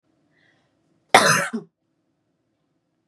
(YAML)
cough_length: 3.1 s
cough_amplitude: 32767
cough_signal_mean_std_ratio: 0.25
survey_phase: beta (2021-08-13 to 2022-03-07)
age: 18-44
gender: Female
wearing_mask: 'No'
symptom_none: true
smoker_status: Never smoked
respiratory_condition_asthma: false
respiratory_condition_other: false
recruitment_source: REACT
submission_delay: 1 day
covid_test_result: Negative
covid_test_method: RT-qPCR
influenza_a_test_result: Negative
influenza_b_test_result: Negative